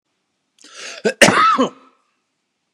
{"cough_length": "2.7 s", "cough_amplitude": 32768, "cough_signal_mean_std_ratio": 0.37, "survey_phase": "beta (2021-08-13 to 2022-03-07)", "age": "65+", "gender": "Male", "wearing_mask": "No", "symptom_cough_any": true, "symptom_runny_or_blocked_nose": true, "symptom_headache": true, "symptom_onset": "4 days", "smoker_status": "Never smoked", "respiratory_condition_asthma": false, "respiratory_condition_other": false, "recruitment_source": "Test and Trace", "submission_delay": "2 days", "covid_test_result": "Negative", "covid_test_method": "RT-qPCR"}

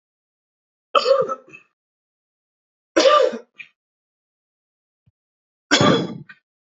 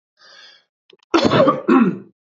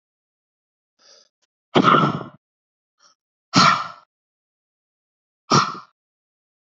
{"three_cough_length": "6.7 s", "three_cough_amplitude": 27604, "three_cough_signal_mean_std_ratio": 0.32, "cough_length": "2.2 s", "cough_amplitude": 28722, "cough_signal_mean_std_ratio": 0.49, "exhalation_length": "6.7 s", "exhalation_amplitude": 27444, "exhalation_signal_mean_std_ratio": 0.29, "survey_phase": "beta (2021-08-13 to 2022-03-07)", "age": "18-44", "gender": "Male", "wearing_mask": "No", "symptom_none": true, "smoker_status": "Never smoked", "respiratory_condition_asthma": false, "respiratory_condition_other": false, "recruitment_source": "REACT", "submission_delay": "1 day", "covid_test_result": "Negative", "covid_test_method": "RT-qPCR", "influenza_a_test_result": "Negative", "influenza_b_test_result": "Negative"}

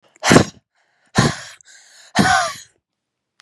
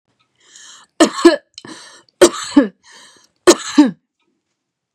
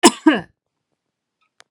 {"exhalation_length": "3.4 s", "exhalation_amplitude": 32768, "exhalation_signal_mean_std_ratio": 0.37, "three_cough_length": "4.9 s", "three_cough_amplitude": 32768, "three_cough_signal_mean_std_ratio": 0.31, "cough_length": "1.7 s", "cough_amplitude": 32768, "cough_signal_mean_std_ratio": 0.26, "survey_phase": "beta (2021-08-13 to 2022-03-07)", "age": "18-44", "gender": "Female", "wearing_mask": "No", "symptom_none": true, "smoker_status": "Never smoked", "respiratory_condition_asthma": false, "respiratory_condition_other": false, "recruitment_source": "REACT", "submission_delay": "2 days", "covid_test_result": "Negative", "covid_test_method": "RT-qPCR", "influenza_a_test_result": "Negative", "influenza_b_test_result": "Negative"}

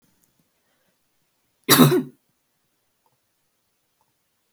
{"cough_length": "4.5 s", "cough_amplitude": 31050, "cough_signal_mean_std_ratio": 0.21, "survey_phase": "beta (2021-08-13 to 2022-03-07)", "age": "18-44", "gender": "Female", "wearing_mask": "No", "symptom_fatigue": true, "symptom_onset": "13 days", "smoker_status": "Never smoked", "respiratory_condition_asthma": false, "respiratory_condition_other": false, "recruitment_source": "REACT", "submission_delay": "0 days", "covid_test_result": "Negative", "covid_test_method": "RT-qPCR", "influenza_a_test_result": "Negative", "influenza_b_test_result": "Negative"}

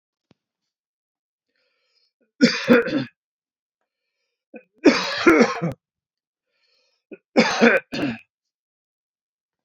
{"three_cough_length": "9.6 s", "three_cough_amplitude": 32108, "three_cough_signal_mean_std_ratio": 0.32, "survey_phase": "beta (2021-08-13 to 2022-03-07)", "age": "45-64", "gender": "Male", "wearing_mask": "No", "symptom_none": true, "smoker_status": "Never smoked", "respiratory_condition_asthma": false, "respiratory_condition_other": false, "recruitment_source": "REACT", "submission_delay": "1 day", "covid_test_result": "Negative", "covid_test_method": "RT-qPCR"}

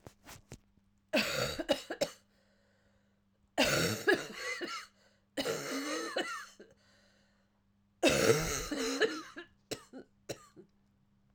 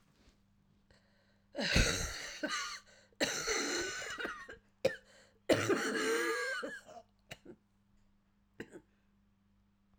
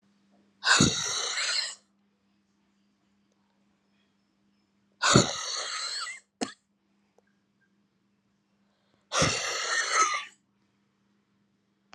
{"three_cough_length": "11.3 s", "three_cough_amplitude": 7920, "three_cough_signal_mean_std_ratio": 0.46, "cough_length": "10.0 s", "cough_amplitude": 6007, "cough_signal_mean_std_ratio": 0.49, "exhalation_length": "11.9 s", "exhalation_amplitude": 22934, "exhalation_signal_mean_std_ratio": 0.37, "survey_phase": "alpha (2021-03-01 to 2021-08-12)", "age": "45-64", "gender": "Female", "wearing_mask": "No", "symptom_cough_any": true, "symptom_new_continuous_cough": true, "symptom_shortness_of_breath": true, "symptom_abdominal_pain": true, "symptom_fatigue": true, "symptom_fever_high_temperature": true, "symptom_change_to_sense_of_smell_or_taste": true, "symptom_onset": "5 days", "smoker_status": "Never smoked", "respiratory_condition_asthma": false, "respiratory_condition_other": false, "recruitment_source": "Test and Trace", "submission_delay": "2 days", "covid_test_result": "Positive", "covid_test_method": "RT-qPCR", "covid_ct_value": 16.0, "covid_ct_gene": "ORF1ab gene", "covid_ct_mean": 17.2, "covid_viral_load": "2400000 copies/ml", "covid_viral_load_category": "High viral load (>1M copies/ml)"}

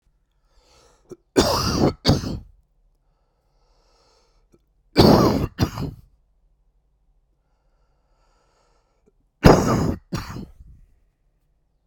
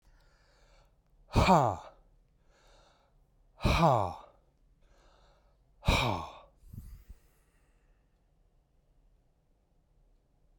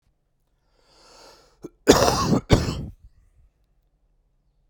{"three_cough_length": "11.9 s", "three_cough_amplitude": 32768, "three_cough_signal_mean_std_ratio": 0.31, "exhalation_length": "10.6 s", "exhalation_amplitude": 8956, "exhalation_signal_mean_std_ratio": 0.29, "cough_length": "4.7 s", "cough_amplitude": 32767, "cough_signal_mean_std_ratio": 0.31, "survey_phase": "beta (2021-08-13 to 2022-03-07)", "age": "45-64", "gender": "Male", "wearing_mask": "No", "symptom_cough_any": true, "symptom_change_to_sense_of_smell_or_taste": true, "symptom_loss_of_taste": true, "smoker_status": "Current smoker (1 to 10 cigarettes per day)", "respiratory_condition_asthma": false, "respiratory_condition_other": false, "recruitment_source": "Test and Trace", "submission_delay": "28 days", "covid_test_result": "Negative", "covid_test_method": "ePCR"}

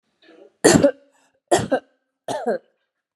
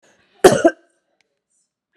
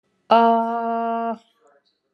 {"three_cough_length": "3.2 s", "three_cough_amplitude": 32767, "three_cough_signal_mean_std_ratio": 0.35, "cough_length": "2.0 s", "cough_amplitude": 32768, "cough_signal_mean_std_ratio": 0.24, "exhalation_length": "2.1 s", "exhalation_amplitude": 25967, "exhalation_signal_mean_std_ratio": 0.56, "survey_phase": "alpha (2021-03-01 to 2021-08-12)", "age": "45-64", "gender": "Female", "wearing_mask": "No", "symptom_none": true, "smoker_status": "Never smoked", "respiratory_condition_asthma": false, "respiratory_condition_other": false, "recruitment_source": "REACT", "submission_delay": "2 days", "covid_test_result": "Negative", "covid_test_method": "RT-qPCR"}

